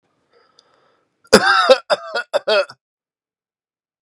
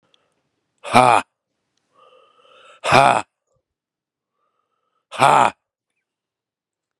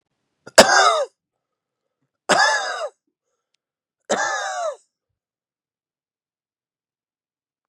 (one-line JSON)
{"cough_length": "4.0 s", "cough_amplitude": 32768, "cough_signal_mean_std_ratio": 0.34, "exhalation_length": "7.0 s", "exhalation_amplitude": 32768, "exhalation_signal_mean_std_ratio": 0.26, "three_cough_length": "7.7 s", "three_cough_amplitude": 32768, "three_cough_signal_mean_std_ratio": 0.31, "survey_phase": "beta (2021-08-13 to 2022-03-07)", "age": "45-64", "gender": "Male", "wearing_mask": "No", "symptom_cough_any": true, "symptom_runny_or_blocked_nose": true, "symptom_sore_throat": true, "symptom_fatigue": true, "symptom_headache": true, "symptom_change_to_sense_of_smell_or_taste": true, "symptom_onset": "4 days", "smoker_status": "Never smoked", "respiratory_condition_asthma": false, "respiratory_condition_other": false, "recruitment_source": "Test and Trace", "submission_delay": "1 day", "covid_test_result": "Positive", "covid_test_method": "RT-qPCR", "covid_ct_value": 17.4, "covid_ct_gene": "ORF1ab gene", "covid_ct_mean": 17.8, "covid_viral_load": "1500000 copies/ml", "covid_viral_load_category": "High viral load (>1M copies/ml)"}